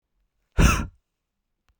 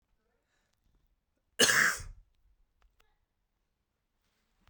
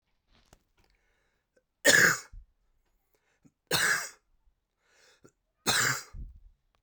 {
  "exhalation_length": "1.8 s",
  "exhalation_amplitude": 20035,
  "exhalation_signal_mean_std_ratio": 0.3,
  "cough_length": "4.7 s",
  "cough_amplitude": 10077,
  "cough_signal_mean_std_ratio": 0.23,
  "three_cough_length": "6.8 s",
  "three_cough_amplitude": 18122,
  "three_cough_signal_mean_std_ratio": 0.3,
  "survey_phase": "beta (2021-08-13 to 2022-03-07)",
  "age": "18-44",
  "gender": "Male",
  "wearing_mask": "No",
  "symptom_cough_any": true,
  "symptom_runny_or_blocked_nose": true,
  "symptom_abdominal_pain": true,
  "symptom_fatigue": true,
  "symptom_headache": true,
  "symptom_change_to_sense_of_smell_or_taste": true,
  "symptom_onset": "3 days",
  "smoker_status": "Never smoked",
  "respiratory_condition_asthma": false,
  "respiratory_condition_other": false,
  "recruitment_source": "Test and Trace",
  "submission_delay": "2 days",
  "covid_test_result": "Positive",
  "covid_test_method": "RT-qPCR",
  "covid_ct_value": 23.4,
  "covid_ct_gene": "N gene"
}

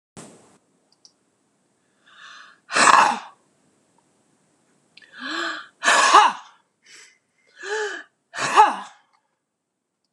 {
  "exhalation_length": "10.1 s",
  "exhalation_amplitude": 26028,
  "exhalation_signal_mean_std_ratio": 0.32,
  "survey_phase": "alpha (2021-03-01 to 2021-08-12)",
  "age": "65+",
  "gender": "Female",
  "wearing_mask": "No",
  "symptom_none": true,
  "smoker_status": "Ex-smoker",
  "respiratory_condition_asthma": true,
  "respiratory_condition_other": false,
  "recruitment_source": "REACT",
  "submission_delay": "1 day",
  "covid_test_result": "Negative",
  "covid_test_method": "RT-qPCR"
}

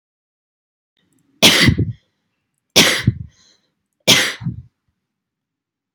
{
  "three_cough_length": "5.9 s",
  "three_cough_amplitude": 32768,
  "three_cough_signal_mean_std_ratio": 0.33,
  "survey_phase": "beta (2021-08-13 to 2022-03-07)",
  "age": "18-44",
  "gender": "Female",
  "wearing_mask": "No",
  "symptom_none": true,
  "symptom_onset": "12 days",
  "smoker_status": "Never smoked",
  "respiratory_condition_asthma": false,
  "respiratory_condition_other": false,
  "recruitment_source": "REACT",
  "submission_delay": "1 day",
  "covid_test_result": "Negative",
  "covid_test_method": "RT-qPCR"
}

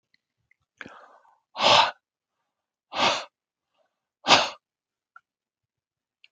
{
  "exhalation_length": "6.3 s",
  "exhalation_amplitude": 25878,
  "exhalation_signal_mean_std_ratio": 0.26,
  "survey_phase": "alpha (2021-03-01 to 2021-08-12)",
  "age": "18-44",
  "gender": "Male",
  "wearing_mask": "No",
  "symptom_none": true,
  "symptom_onset": "7 days",
  "smoker_status": "Never smoked",
  "respiratory_condition_asthma": false,
  "respiratory_condition_other": false,
  "recruitment_source": "REACT",
  "submission_delay": "3 days",
  "covid_test_result": "Negative",
  "covid_test_method": "RT-qPCR"
}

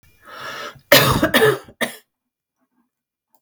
{
  "cough_length": "3.4 s",
  "cough_amplitude": 32768,
  "cough_signal_mean_std_ratio": 0.37,
  "survey_phase": "beta (2021-08-13 to 2022-03-07)",
  "age": "45-64",
  "gender": "Female",
  "wearing_mask": "No",
  "symptom_none": true,
  "smoker_status": "Never smoked",
  "respiratory_condition_asthma": false,
  "respiratory_condition_other": false,
  "recruitment_source": "REACT",
  "submission_delay": "1 day",
  "covid_test_result": "Negative",
  "covid_test_method": "RT-qPCR",
  "influenza_a_test_result": "Negative",
  "influenza_b_test_result": "Negative"
}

